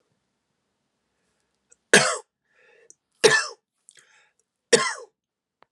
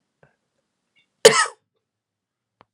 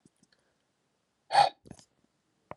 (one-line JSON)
{"three_cough_length": "5.7 s", "three_cough_amplitude": 32381, "three_cough_signal_mean_std_ratio": 0.24, "cough_length": "2.7 s", "cough_amplitude": 32768, "cough_signal_mean_std_ratio": 0.18, "exhalation_length": "2.6 s", "exhalation_amplitude": 12313, "exhalation_signal_mean_std_ratio": 0.2, "survey_phase": "alpha (2021-03-01 to 2021-08-12)", "age": "45-64", "gender": "Male", "wearing_mask": "No", "symptom_cough_any": true, "symptom_diarrhoea": true, "symptom_fatigue": true, "symptom_headache": true, "symptom_onset": "4 days", "smoker_status": "Never smoked", "respiratory_condition_asthma": false, "respiratory_condition_other": false, "recruitment_source": "Test and Trace", "submission_delay": "2 days", "covid_test_result": "Positive", "covid_test_method": "RT-qPCR", "covid_ct_value": 14.6, "covid_ct_gene": "N gene", "covid_ct_mean": 15.0, "covid_viral_load": "12000000 copies/ml", "covid_viral_load_category": "High viral load (>1M copies/ml)"}